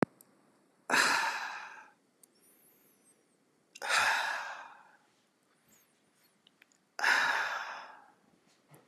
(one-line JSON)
{"exhalation_length": "8.9 s", "exhalation_amplitude": 11284, "exhalation_signal_mean_std_ratio": 0.4, "survey_phase": "beta (2021-08-13 to 2022-03-07)", "age": "45-64", "gender": "Male", "wearing_mask": "No", "symptom_none": true, "smoker_status": "Never smoked", "respiratory_condition_asthma": false, "respiratory_condition_other": false, "recruitment_source": "REACT", "submission_delay": "1 day", "covid_test_result": "Negative", "covid_test_method": "RT-qPCR", "influenza_a_test_result": "Negative", "influenza_b_test_result": "Negative"}